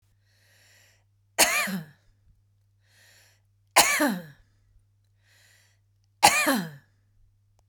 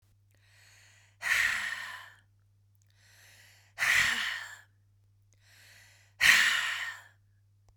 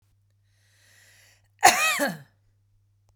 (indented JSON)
{
  "three_cough_length": "7.7 s",
  "three_cough_amplitude": 29317,
  "three_cough_signal_mean_std_ratio": 0.3,
  "exhalation_length": "7.8 s",
  "exhalation_amplitude": 13097,
  "exhalation_signal_mean_std_ratio": 0.39,
  "cough_length": "3.2 s",
  "cough_amplitude": 29782,
  "cough_signal_mean_std_ratio": 0.28,
  "survey_phase": "beta (2021-08-13 to 2022-03-07)",
  "age": "45-64",
  "gender": "Female",
  "wearing_mask": "No",
  "symptom_none": true,
  "smoker_status": "Ex-smoker",
  "respiratory_condition_asthma": false,
  "respiratory_condition_other": false,
  "recruitment_source": "REACT",
  "submission_delay": "2 days",
  "covid_test_result": "Negative",
  "covid_test_method": "RT-qPCR",
  "influenza_a_test_result": "Unknown/Void",
  "influenza_b_test_result": "Unknown/Void"
}